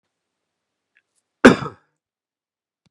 {
  "cough_length": "2.9 s",
  "cough_amplitude": 32768,
  "cough_signal_mean_std_ratio": 0.16,
  "survey_phase": "beta (2021-08-13 to 2022-03-07)",
  "age": "45-64",
  "gender": "Male",
  "wearing_mask": "No",
  "symptom_cough_any": true,
  "symptom_runny_or_blocked_nose": true,
  "symptom_sore_throat": true,
  "symptom_change_to_sense_of_smell_or_taste": true,
  "symptom_loss_of_taste": true,
  "symptom_onset": "5 days",
  "smoker_status": "Ex-smoker",
  "respiratory_condition_asthma": false,
  "respiratory_condition_other": false,
  "recruitment_source": "Test and Trace",
  "submission_delay": "2 days",
  "covid_test_result": "Positive",
  "covid_test_method": "ePCR"
}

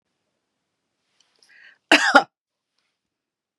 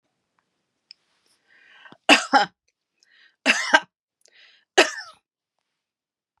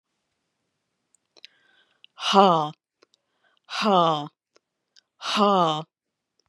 {
  "cough_length": "3.6 s",
  "cough_amplitude": 32768,
  "cough_signal_mean_std_ratio": 0.2,
  "three_cough_length": "6.4 s",
  "three_cough_amplitude": 32455,
  "three_cough_signal_mean_std_ratio": 0.23,
  "exhalation_length": "6.5 s",
  "exhalation_amplitude": 28657,
  "exhalation_signal_mean_std_ratio": 0.34,
  "survey_phase": "beta (2021-08-13 to 2022-03-07)",
  "age": "45-64",
  "gender": "Female",
  "wearing_mask": "No",
  "symptom_none": true,
  "smoker_status": "Never smoked",
  "respiratory_condition_asthma": false,
  "respiratory_condition_other": false,
  "recruitment_source": "REACT",
  "submission_delay": "2 days",
  "covid_test_result": "Negative",
  "covid_test_method": "RT-qPCR",
  "influenza_a_test_result": "Negative",
  "influenza_b_test_result": "Negative"
}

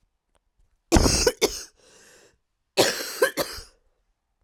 {
  "cough_length": "4.4 s",
  "cough_amplitude": 27547,
  "cough_signal_mean_std_ratio": 0.37,
  "survey_phase": "beta (2021-08-13 to 2022-03-07)",
  "age": "18-44",
  "gender": "Female",
  "wearing_mask": "No",
  "symptom_cough_any": true,
  "symptom_new_continuous_cough": true,
  "symptom_runny_or_blocked_nose": true,
  "symptom_fatigue": true,
  "symptom_onset": "2 days",
  "smoker_status": "Ex-smoker",
  "respiratory_condition_asthma": false,
  "respiratory_condition_other": false,
  "recruitment_source": "Test and Trace",
  "submission_delay": "1 day",
  "covid_test_result": "Positive",
  "covid_test_method": "RT-qPCR",
  "covid_ct_value": 20.9,
  "covid_ct_gene": "ORF1ab gene",
  "covid_ct_mean": 20.9,
  "covid_viral_load": "140000 copies/ml",
  "covid_viral_load_category": "Low viral load (10K-1M copies/ml)"
}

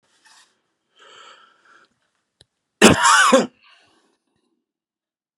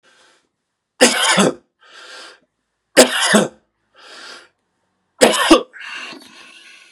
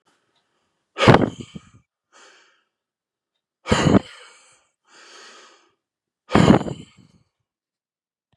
{
  "cough_length": "5.4 s",
  "cough_amplitude": 32768,
  "cough_signal_mean_std_ratio": 0.27,
  "three_cough_length": "6.9 s",
  "three_cough_amplitude": 32768,
  "three_cough_signal_mean_std_ratio": 0.36,
  "exhalation_length": "8.4 s",
  "exhalation_amplitude": 32768,
  "exhalation_signal_mean_std_ratio": 0.25,
  "survey_phase": "beta (2021-08-13 to 2022-03-07)",
  "age": "45-64",
  "gender": "Male",
  "wearing_mask": "No",
  "symptom_fatigue": true,
  "smoker_status": "Never smoked",
  "respiratory_condition_asthma": false,
  "respiratory_condition_other": false,
  "recruitment_source": "Test and Trace",
  "submission_delay": "3 days",
  "covid_test_result": "Negative",
  "covid_test_method": "RT-qPCR"
}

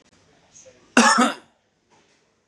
{
  "cough_length": "2.5 s",
  "cough_amplitude": 31638,
  "cough_signal_mean_std_ratio": 0.31,
  "survey_phase": "beta (2021-08-13 to 2022-03-07)",
  "age": "18-44",
  "gender": "Male",
  "wearing_mask": "No",
  "symptom_none": true,
  "symptom_onset": "12 days",
  "smoker_status": "Never smoked",
  "respiratory_condition_asthma": false,
  "respiratory_condition_other": false,
  "recruitment_source": "REACT",
  "submission_delay": "3 days",
  "covid_test_result": "Negative",
  "covid_test_method": "RT-qPCR",
  "influenza_a_test_result": "Negative",
  "influenza_b_test_result": "Negative"
}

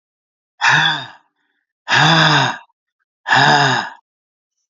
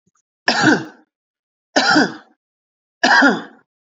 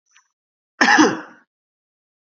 {
  "exhalation_length": "4.7 s",
  "exhalation_amplitude": 32537,
  "exhalation_signal_mean_std_ratio": 0.51,
  "three_cough_length": "3.8 s",
  "three_cough_amplitude": 30986,
  "three_cough_signal_mean_std_ratio": 0.43,
  "cough_length": "2.2 s",
  "cough_amplitude": 28525,
  "cough_signal_mean_std_ratio": 0.32,
  "survey_phase": "beta (2021-08-13 to 2022-03-07)",
  "age": "18-44",
  "gender": "Male",
  "wearing_mask": "No",
  "symptom_headache": true,
  "symptom_onset": "8 days",
  "smoker_status": "Current smoker (e-cigarettes or vapes only)",
  "respiratory_condition_asthma": false,
  "respiratory_condition_other": false,
  "recruitment_source": "REACT",
  "submission_delay": "3 days",
  "covid_test_result": "Negative",
  "covid_test_method": "RT-qPCR",
  "influenza_a_test_result": "Negative",
  "influenza_b_test_result": "Negative"
}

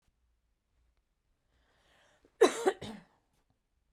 {
  "cough_length": "3.9 s",
  "cough_amplitude": 9926,
  "cough_signal_mean_std_ratio": 0.19,
  "survey_phase": "beta (2021-08-13 to 2022-03-07)",
  "age": "45-64",
  "gender": "Female",
  "wearing_mask": "No",
  "symptom_none": true,
  "smoker_status": "Never smoked",
  "respiratory_condition_asthma": true,
  "respiratory_condition_other": false,
  "recruitment_source": "REACT",
  "submission_delay": "2 days",
  "covid_test_result": "Negative",
  "covid_test_method": "RT-qPCR"
}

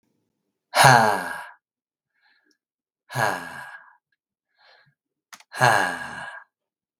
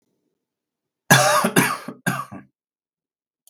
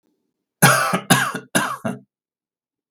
{
  "exhalation_length": "7.0 s",
  "exhalation_amplitude": 32768,
  "exhalation_signal_mean_std_ratio": 0.31,
  "cough_length": "3.5 s",
  "cough_amplitude": 32768,
  "cough_signal_mean_std_ratio": 0.36,
  "three_cough_length": "2.9 s",
  "three_cough_amplitude": 32768,
  "three_cough_signal_mean_std_ratio": 0.42,
  "survey_phase": "beta (2021-08-13 to 2022-03-07)",
  "age": "45-64",
  "gender": "Male",
  "wearing_mask": "No",
  "symptom_cough_any": true,
  "smoker_status": "Never smoked",
  "respiratory_condition_asthma": false,
  "respiratory_condition_other": false,
  "recruitment_source": "REACT",
  "submission_delay": "6 days",
  "covid_test_result": "Negative",
  "covid_test_method": "RT-qPCR",
  "influenza_a_test_result": "Negative",
  "influenza_b_test_result": "Negative"
}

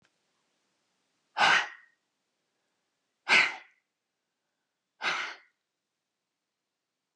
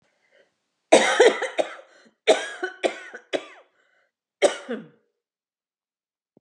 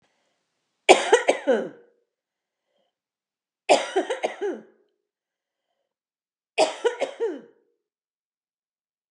{
  "exhalation_length": "7.2 s",
  "exhalation_amplitude": 10764,
  "exhalation_signal_mean_std_ratio": 0.25,
  "cough_length": "6.4 s",
  "cough_amplitude": 30322,
  "cough_signal_mean_std_ratio": 0.31,
  "three_cough_length": "9.1 s",
  "three_cough_amplitude": 32768,
  "three_cough_signal_mean_std_ratio": 0.29,
  "survey_phase": "beta (2021-08-13 to 2022-03-07)",
  "age": "45-64",
  "gender": "Female",
  "wearing_mask": "No",
  "symptom_cough_any": true,
  "smoker_status": "Ex-smoker",
  "respiratory_condition_asthma": false,
  "respiratory_condition_other": false,
  "recruitment_source": "REACT",
  "submission_delay": "2 days",
  "covid_test_result": "Negative",
  "covid_test_method": "RT-qPCR",
  "influenza_a_test_result": "Unknown/Void",
  "influenza_b_test_result": "Unknown/Void"
}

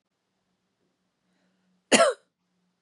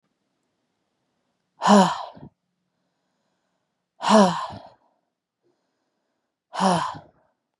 {
  "cough_length": "2.8 s",
  "cough_amplitude": 21225,
  "cough_signal_mean_std_ratio": 0.21,
  "exhalation_length": "7.6 s",
  "exhalation_amplitude": 24771,
  "exhalation_signal_mean_std_ratio": 0.29,
  "survey_phase": "beta (2021-08-13 to 2022-03-07)",
  "age": "45-64",
  "gender": "Female",
  "wearing_mask": "No",
  "symptom_cough_any": true,
  "symptom_runny_or_blocked_nose": true,
  "symptom_shortness_of_breath": true,
  "symptom_sore_throat": true,
  "symptom_diarrhoea": true,
  "symptom_fatigue": true,
  "smoker_status": "Ex-smoker",
  "respiratory_condition_asthma": false,
  "respiratory_condition_other": false,
  "recruitment_source": "Test and Trace",
  "submission_delay": "2 days",
  "covid_test_result": "Positive",
  "covid_test_method": "RT-qPCR",
  "covid_ct_value": 27.4,
  "covid_ct_gene": "ORF1ab gene",
  "covid_ct_mean": 27.7,
  "covid_viral_load": "790 copies/ml",
  "covid_viral_load_category": "Minimal viral load (< 10K copies/ml)"
}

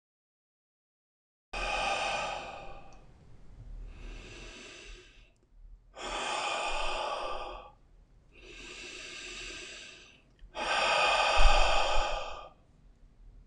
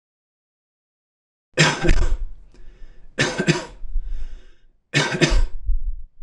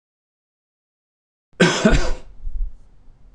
{
  "exhalation_length": "13.5 s",
  "exhalation_amplitude": 10871,
  "exhalation_signal_mean_std_ratio": 0.46,
  "three_cough_length": "6.2 s",
  "three_cough_amplitude": 25929,
  "three_cough_signal_mean_std_ratio": 0.56,
  "cough_length": "3.3 s",
  "cough_amplitude": 25939,
  "cough_signal_mean_std_ratio": 0.42,
  "survey_phase": "beta (2021-08-13 to 2022-03-07)",
  "age": "45-64",
  "gender": "Male",
  "wearing_mask": "No",
  "symptom_cough_any": true,
  "symptom_runny_or_blocked_nose": true,
  "symptom_headache": true,
  "symptom_onset": "4 days",
  "smoker_status": "Never smoked",
  "respiratory_condition_asthma": false,
  "respiratory_condition_other": false,
  "recruitment_source": "REACT",
  "submission_delay": "1 day",
  "covid_test_result": "Negative",
  "covid_test_method": "RT-qPCR"
}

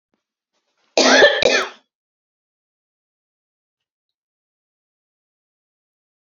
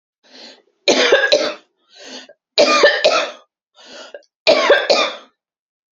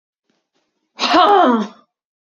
{
  "cough_length": "6.2 s",
  "cough_amplitude": 31054,
  "cough_signal_mean_std_ratio": 0.25,
  "three_cough_length": "6.0 s",
  "three_cough_amplitude": 29248,
  "three_cough_signal_mean_std_ratio": 0.48,
  "exhalation_length": "2.2 s",
  "exhalation_amplitude": 30020,
  "exhalation_signal_mean_std_ratio": 0.45,
  "survey_phase": "beta (2021-08-13 to 2022-03-07)",
  "age": "45-64",
  "gender": "Female",
  "wearing_mask": "No",
  "symptom_none": true,
  "smoker_status": "Never smoked",
  "respiratory_condition_asthma": true,
  "respiratory_condition_other": false,
  "recruitment_source": "REACT",
  "submission_delay": "2 days",
  "covid_test_result": "Negative",
  "covid_test_method": "RT-qPCR",
  "influenza_a_test_result": "Negative",
  "influenza_b_test_result": "Negative"
}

